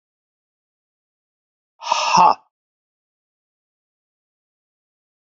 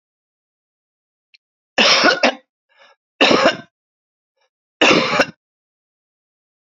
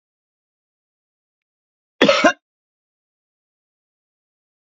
{
  "exhalation_length": "5.2 s",
  "exhalation_amplitude": 32768,
  "exhalation_signal_mean_std_ratio": 0.22,
  "three_cough_length": "6.7 s",
  "three_cough_amplitude": 29802,
  "three_cough_signal_mean_std_ratio": 0.35,
  "cough_length": "4.6 s",
  "cough_amplitude": 32767,
  "cough_signal_mean_std_ratio": 0.19,
  "survey_phase": "beta (2021-08-13 to 2022-03-07)",
  "age": "45-64",
  "gender": "Male",
  "wearing_mask": "Yes",
  "symptom_cough_any": true,
  "symptom_change_to_sense_of_smell_or_taste": true,
  "symptom_loss_of_taste": true,
  "symptom_onset": "4 days",
  "smoker_status": "Current smoker (1 to 10 cigarettes per day)",
  "respiratory_condition_asthma": false,
  "respiratory_condition_other": false,
  "recruitment_source": "Test and Trace",
  "submission_delay": "1 day",
  "covid_test_result": "Positive",
  "covid_test_method": "RT-qPCR",
  "covid_ct_value": 14.1,
  "covid_ct_gene": "ORF1ab gene"
}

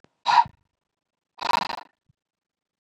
{
  "exhalation_length": "2.8 s",
  "exhalation_amplitude": 18430,
  "exhalation_signal_mean_std_ratio": 0.27,
  "survey_phase": "beta (2021-08-13 to 2022-03-07)",
  "age": "45-64",
  "gender": "Male",
  "wearing_mask": "No",
  "symptom_none": true,
  "smoker_status": "Never smoked",
  "respiratory_condition_asthma": false,
  "respiratory_condition_other": false,
  "recruitment_source": "REACT",
  "submission_delay": "0 days",
  "covid_test_result": "Negative",
  "covid_test_method": "RT-qPCR",
  "influenza_a_test_result": "Negative",
  "influenza_b_test_result": "Negative"
}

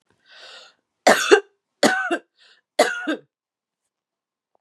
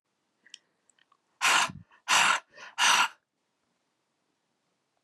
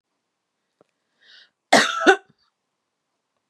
{
  "three_cough_length": "4.6 s",
  "three_cough_amplitude": 31399,
  "three_cough_signal_mean_std_ratio": 0.32,
  "exhalation_length": "5.0 s",
  "exhalation_amplitude": 10802,
  "exhalation_signal_mean_std_ratio": 0.34,
  "cough_length": "3.5 s",
  "cough_amplitude": 32767,
  "cough_signal_mean_std_ratio": 0.24,
  "survey_phase": "beta (2021-08-13 to 2022-03-07)",
  "age": "45-64",
  "gender": "Female",
  "wearing_mask": "No",
  "symptom_none": true,
  "smoker_status": "Never smoked",
  "respiratory_condition_asthma": false,
  "respiratory_condition_other": false,
  "recruitment_source": "REACT",
  "submission_delay": "2 days",
  "covid_test_result": "Negative",
  "covid_test_method": "RT-qPCR",
  "influenza_a_test_result": "Negative",
  "influenza_b_test_result": "Negative"
}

